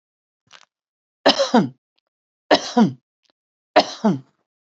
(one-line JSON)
{"three_cough_length": "4.6 s", "three_cough_amplitude": 27881, "three_cough_signal_mean_std_ratio": 0.32, "survey_phase": "alpha (2021-03-01 to 2021-08-12)", "age": "45-64", "gender": "Female", "wearing_mask": "No", "symptom_none": true, "smoker_status": "Never smoked", "respiratory_condition_asthma": false, "respiratory_condition_other": false, "recruitment_source": "REACT", "submission_delay": "2 days", "covid_test_result": "Negative", "covid_test_method": "RT-qPCR"}